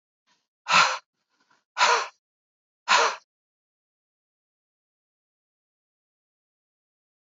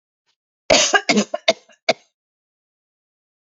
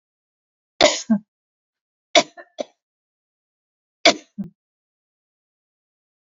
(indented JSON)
{
  "exhalation_length": "7.3 s",
  "exhalation_amplitude": 17471,
  "exhalation_signal_mean_std_ratio": 0.25,
  "cough_length": "3.5 s",
  "cough_amplitude": 30631,
  "cough_signal_mean_std_ratio": 0.3,
  "three_cough_length": "6.2 s",
  "three_cough_amplitude": 31073,
  "three_cough_signal_mean_std_ratio": 0.2,
  "survey_phase": "alpha (2021-03-01 to 2021-08-12)",
  "age": "45-64",
  "gender": "Female",
  "wearing_mask": "No",
  "symptom_none": true,
  "symptom_onset": "12 days",
  "smoker_status": "Ex-smoker",
  "respiratory_condition_asthma": false,
  "respiratory_condition_other": false,
  "recruitment_source": "REACT",
  "submission_delay": "31 days",
  "covid_test_result": "Negative",
  "covid_test_method": "RT-qPCR"
}